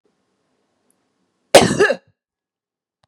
{"cough_length": "3.1 s", "cough_amplitude": 32768, "cough_signal_mean_std_ratio": 0.24, "survey_phase": "beta (2021-08-13 to 2022-03-07)", "age": "45-64", "gender": "Female", "wearing_mask": "No", "symptom_runny_or_blocked_nose": true, "symptom_fatigue": true, "symptom_change_to_sense_of_smell_or_taste": true, "smoker_status": "Never smoked", "respiratory_condition_asthma": false, "respiratory_condition_other": false, "recruitment_source": "Test and Trace", "submission_delay": "1 day", "covid_test_result": "Positive", "covid_test_method": "RT-qPCR", "covid_ct_value": 18.7, "covid_ct_gene": "ORF1ab gene"}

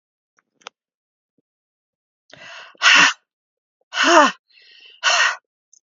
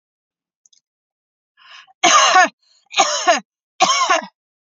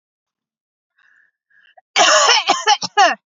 {"exhalation_length": "5.9 s", "exhalation_amplitude": 31256, "exhalation_signal_mean_std_ratio": 0.33, "three_cough_length": "4.6 s", "three_cough_amplitude": 32498, "three_cough_signal_mean_std_ratio": 0.42, "cough_length": "3.3 s", "cough_amplitude": 32767, "cough_signal_mean_std_ratio": 0.43, "survey_phase": "beta (2021-08-13 to 2022-03-07)", "age": "18-44", "gender": "Female", "wearing_mask": "No", "symptom_none": true, "smoker_status": "Never smoked", "respiratory_condition_asthma": false, "respiratory_condition_other": false, "recruitment_source": "REACT", "submission_delay": "8 days", "covid_test_result": "Negative", "covid_test_method": "RT-qPCR"}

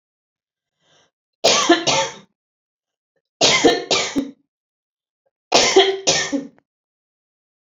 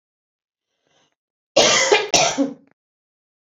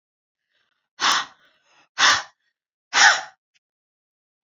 {"three_cough_length": "7.7 s", "three_cough_amplitude": 29335, "three_cough_signal_mean_std_ratio": 0.4, "cough_length": "3.6 s", "cough_amplitude": 30563, "cough_signal_mean_std_ratio": 0.38, "exhalation_length": "4.4 s", "exhalation_amplitude": 29760, "exhalation_signal_mean_std_ratio": 0.31, "survey_phase": "beta (2021-08-13 to 2022-03-07)", "age": "45-64", "gender": "Female", "wearing_mask": "No", "symptom_none": true, "smoker_status": "Ex-smoker", "respiratory_condition_asthma": true, "respiratory_condition_other": false, "recruitment_source": "REACT", "submission_delay": "3 days", "covid_test_result": "Negative", "covid_test_method": "RT-qPCR", "influenza_a_test_result": "Negative", "influenza_b_test_result": "Negative"}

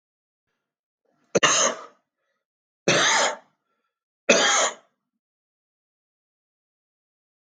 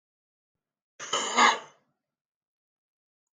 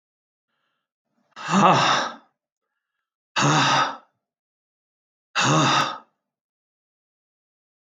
{"three_cough_length": "7.5 s", "three_cough_amplitude": 24387, "three_cough_signal_mean_std_ratio": 0.33, "cough_length": "3.3 s", "cough_amplitude": 13085, "cough_signal_mean_std_ratio": 0.27, "exhalation_length": "7.9 s", "exhalation_amplitude": 22225, "exhalation_signal_mean_std_ratio": 0.39, "survey_phase": "alpha (2021-03-01 to 2021-08-12)", "age": "65+", "gender": "Male", "wearing_mask": "No", "symptom_cough_any": true, "smoker_status": "Never smoked", "respiratory_condition_asthma": false, "respiratory_condition_other": false, "recruitment_source": "REACT", "submission_delay": "2 days", "covid_test_result": "Negative", "covid_test_method": "RT-qPCR"}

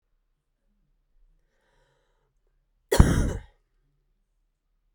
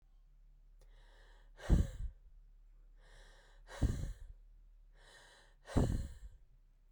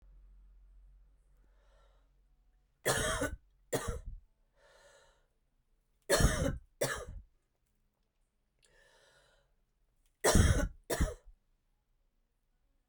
{"cough_length": "4.9 s", "cough_amplitude": 32767, "cough_signal_mean_std_ratio": 0.19, "exhalation_length": "6.9 s", "exhalation_amplitude": 4274, "exhalation_signal_mean_std_ratio": 0.36, "three_cough_length": "12.9 s", "three_cough_amplitude": 7774, "three_cough_signal_mean_std_ratio": 0.31, "survey_phase": "beta (2021-08-13 to 2022-03-07)", "age": "18-44", "gender": "Female", "wearing_mask": "No", "symptom_cough_any": true, "symptom_runny_or_blocked_nose": true, "symptom_sore_throat": true, "symptom_fatigue": true, "symptom_fever_high_temperature": true, "symptom_headache": true, "symptom_change_to_sense_of_smell_or_taste": true, "symptom_loss_of_taste": true, "symptom_onset": "2 days", "smoker_status": "Ex-smoker", "respiratory_condition_asthma": false, "respiratory_condition_other": false, "recruitment_source": "Test and Trace", "submission_delay": "1 day", "covid_test_result": "Positive", "covid_test_method": "RT-qPCR", "covid_ct_value": 19.9, "covid_ct_gene": "ORF1ab gene", "covid_ct_mean": 20.6, "covid_viral_load": "170000 copies/ml", "covid_viral_load_category": "Low viral load (10K-1M copies/ml)"}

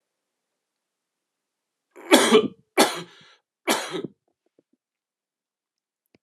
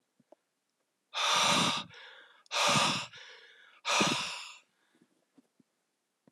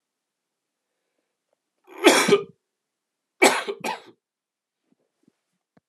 {"three_cough_length": "6.2 s", "three_cough_amplitude": 31609, "three_cough_signal_mean_std_ratio": 0.26, "exhalation_length": "6.3 s", "exhalation_amplitude": 7563, "exhalation_signal_mean_std_ratio": 0.45, "cough_length": "5.9 s", "cough_amplitude": 31675, "cough_signal_mean_std_ratio": 0.25, "survey_phase": "alpha (2021-03-01 to 2021-08-12)", "age": "18-44", "gender": "Male", "wearing_mask": "No", "symptom_cough_any": true, "symptom_new_continuous_cough": true, "symptom_shortness_of_breath": true, "symptom_fatigue": true, "symptom_headache": true, "symptom_change_to_sense_of_smell_or_taste": true, "symptom_onset": "4 days", "smoker_status": "Never smoked", "respiratory_condition_asthma": false, "respiratory_condition_other": false, "recruitment_source": "Test and Trace", "submission_delay": "2 days", "covid_test_result": "Positive", "covid_test_method": "RT-qPCR", "covid_ct_value": 20.5, "covid_ct_gene": "ORF1ab gene", "covid_ct_mean": 20.9, "covid_viral_load": "140000 copies/ml", "covid_viral_load_category": "Low viral load (10K-1M copies/ml)"}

